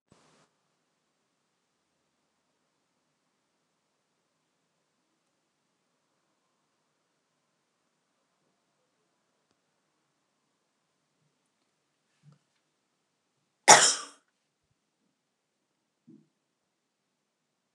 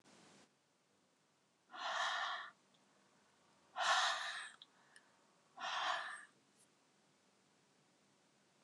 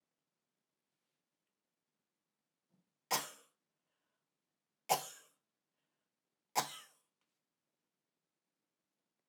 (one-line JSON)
{"cough_length": "17.7 s", "cough_amplitude": 29203, "cough_signal_mean_std_ratio": 0.09, "exhalation_length": "8.6 s", "exhalation_amplitude": 2368, "exhalation_signal_mean_std_ratio": 0.4, "three_cough_length": "9.3 s", "three_cough_amplitude": 4667, "three_cough_signal_mean_std_ratio": 0.16, "survey_phase": "alpha (2021-03-01 to 2021-08-12)", "age": "65+", "gender": "Female", "wearing_mask": "No", "symptom_none": true, "smoker_status": "Never smoked", "respiratory_condition_asthma": false, "respiratory_condition_other": false, "recruitment_source": "REACT", "submission_delay": "2 days", "covid_test_result": "Negative", "covid_test_method": "RT-qPCR"}